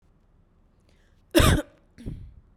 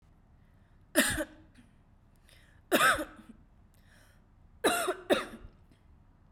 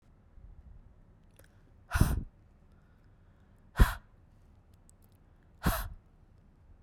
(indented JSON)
{
  "cough_length": "2.6 s",
  "cough_amplitude": 20627,
  "cough_signal_mean_std_ratio": 0.3,
  "three_cough_length": "6.3 s",
  "three_cough_amplitude": 9886,
  "three_cough_signal_mean_std_ratio": 0.35,
  "exhalation_length": "6.8 s",
  "exhalation_amplitude": 13739,
  "exhalation_signal_mean_std_ratio": 0.25,
  "survey_phase": "beta (2021-08-13 to 2022-03-07)",
  "age": "18-44",
  "gender": "Female",
  "wearing_mask": "No",
  "symptom_none": true,
  "symptom_onset": "12 days",
  "smoker_status": "Never smoked",
  "respiratory_condition_asthma": true,
  "respiratory_condition_other": false,
  "recruitment_source": "REACT",
  "submission_delay": "0 days",
  "covid_test_result": "Negative",
  "covid_test_method": "RT-qPCR",
  "influenza_a_test_result": "Negative",
  "influenza_b_test_result": "Negative"
}